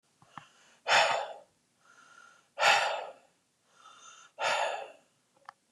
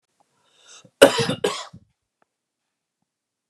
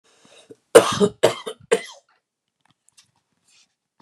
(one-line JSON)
{"exhalation_length": "5.7 s", "exhalation_amplitude": 11047, "exhalation_signal_mean_std_ratio": 0.38, "cough_length": "3.5 s", "cough_amplitude": 32768, "cough_signal_mean_std_ratio": 0.22, "three_cough_length": "4.0 s", "three_cough_amplitude": 32768, "three_cough_signal_mean_std_ratio": 0.24, "survey_phase": "beta (2021-08-13 to 2022-03-07)", "age": "18-44", "gender": "Male", "wearing_mask": "No", "symptom_none": true, "smoker_status": "Never smoked", "respiratory_condition_asthma": false, "respiratory_condition_other": false, "recruitment_source": "REACT", "submission_delay": "1 day", "covid_test_result": "Negative", "covid_test_method": "RT-qPCR", "influenza_a_test_result": "Negative", "influenza_b_test_result": "Negative"}